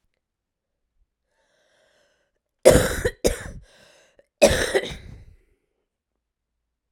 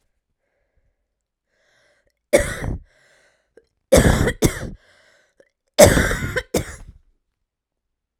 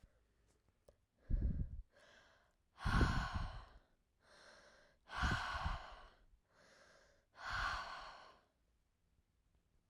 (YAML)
cough_length: 6.9 s
cough_amplitude: 32768
cough_signal_mean_std_ratio: 0.26
three_cough_length: 8.2 s
three_cough_amplitude: 32768
three_cough_signal_mean_std_ratio: 0.31
exhalation_length: 9.9 s
exhalation_amplitude: 2831
exhalation_signal_mean_std_ratio: 0.42
survey_phase: alpha (2021-03-01 to 2021-08-12)
age: 18-44
gender: Female
wearing_mask: 'No'
symptom_cough_any: true
symptom_new_continuous_cough: true
symptom_shortness_of_breath: true
symptom_fatigue: true
symptom_fever_high_temperature: true
symptom_headache: true
symptom_change_to_sense_of_smell_or_taste: true
symptom_onset: 2 days
smoker_status: Current smoker (1 to 10 cigarettes per day)
respiratory_condition_asthma: false
respiratory_condition_other: false
recruitment_source: Test and Trace
submission_delay: 2 days
covid_test_result: Positive
covid_test_method: RT-qPCR
covid_ct_value: 20.3
covid_ct_gene: ORF1ab gene